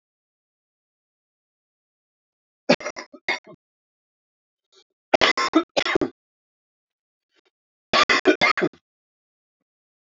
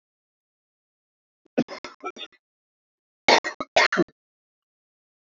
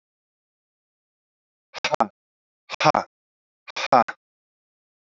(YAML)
three_cough_length: 10.2 s
three_cough_amplitude: 28346
three_cough_signal_mean_std_ratio: 0.26
cough_length: 5.3 s
cough_amplitude: 23161
cough_signal_mean_std_ratio: 0.24
exhalation_length: 5.0 s
exhalation_amplitude: 27606
exhalation_signal_mean_std_ratio: 0.21
survey_phase: alpha (2021-03-01 to 2021-08-12)
age: 45-64
gender: Male
wearing_mask: 'No'
symptom_cough_any: true
symptom_fatigue: true
symptom_headache: true
symptom_change_to_sense_of_smell_or_taste: true
symptom_onset: 3 days
smoker_status: Ex-smoker
respiratory_condition_asthma: true
respiratory_condition_other: false
recruitment_source: Test and Trace
submission_delay: 2 days
covid_test_result: Positive
covid_test_method: RT-qPCR
covid_ct_value: 19.3
covid_ct_gene: ORF1ab gene
covid_ct_mean: 19.8
covid_viral_load: 330000 copies/ml
covid_viral_load_category: Low viral load (10K-1M copies/ml)